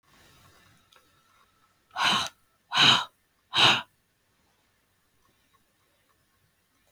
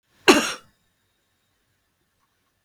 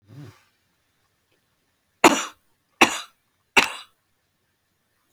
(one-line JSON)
{"exhalation_length": "6.9 s", "exhalation_amplitude": 16447, "exhalation_signal_mean_std_ratio": 0.28, "cough_length": "2.6 s", "cough_amplitude": 32766, "cough_signal_mean_std_ratio": 0.2, "three_cough_length": "5.1 s", "three_cough_amplitude": 32768, "three_cough_signal_mean_std_ratio": 0.2, "survey_phase": "beta (2021-08-13 to 2022-03-07)", "age": "45-64", "gender": "Female", "wearing_mask": "No", "symptom_none": true, "smoker_status": "Never smoked", "respiratory_condition_asthma": false, "respiratory_condition_other": false, "recruitment_source": "REACT", "submission_delay": "1 day", "covid_test_result": "Negative", "covid_test_method": "RT-qPCR", "influenza_a_test_result": "Negative", "influenza_b_test_result": "Negative"}